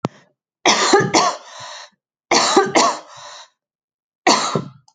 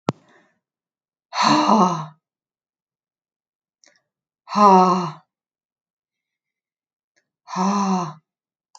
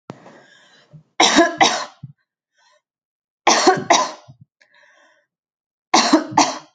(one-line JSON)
{"cough_length": "4.9 s", "cough_amplitude": 32411, "cough_signal_mean_std_ratio": 0.49, "exhalation_length": "8.8 s", "exhalation_amplitude": 28112, "exhalation_signal_mean_std_ratio": 0.35, "three_cough_length": "6.7 s", "three_cough_amplitude": 31804, "three_cough_signal_mean_std_ratio": 0.38, "survey_phase": "alpha (2021-03-01 to 2021-08-12)", "age": "18-44", "gender": "Female", "wearing_mask": "No", "symptom_none": true, "smoker_status": "Never smoked", "respiratory_condition_asthma": false, "respiratory_condition_other": false, "recruitment_source": "Test and Trace", "submission_delay": "3 days", "covid_test_result": "Negative", "covid_test_method": "LFT"}